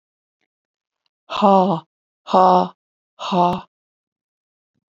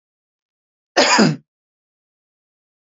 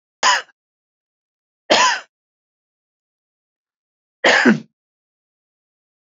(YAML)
exhalation_length: 4.9 s
exhalation_amplitude: 31013
exhalation_signal_mean_std_ratio: 0.34
cough_length: 2.8 s
cough_amplitude: 32767
cough_signal_mean_std_ratio: 0.3
three_cough_length: 6.1 s
three_cough_amplitude: 30459
three_cough_signal_mean_std_ratio: 0.28
survey_phase: beta (2021-08-13 to 2022-03-07)
age: 45-64
gender: Female
wearing_mask: 'No'
symptom_runny_or_blocked_nose: true
symptom_headache: true
smoker_status: Never smoked
respiratory_condition_asthma: false
respiratory_condition_other: false
recruitment_source: REACT
submission_delay: 4 days
covid_test_result: Negative
covid_test_method: RT-qPCR
influenza_a_test_result: Negative
influenza_b_test_result: Negative